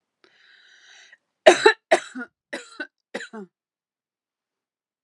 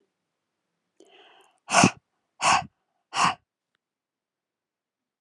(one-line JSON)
{"cough_length": "5.0 s", "cough_amplitude": 32768, "cough_signal_mean_std_ratio": 0.2, "exhalation_length": "5.2 s", "exhalation_amplitude": 23081, "exhalation_signal_mean_std_ratio": 0.25, "survey_phase": "alpha (2021-03-01 to 2021-08-12)", "age": "45-64", "gender": "Female", "wearing_mask": "No", "symptom_cough_any": true, "smoker_status": "Never smoked", "respiratory_condition_asthma": false, "respiratory_condition_other": false, "recruitment_source": "Test and Trace", "submission_delay": "2 days", "covid_test_result": "Positive", "covid_test_method": "RT-qPCR", "covid_ct_value": 26.5, "covid_ct_gene": "ORF1ab gene", "covid_ct_mean": 26.7, "covid_viral_load": "1700 copies/ml", "covid_viral_load_category": "Minimal viral load (< 10K copies/ml)"}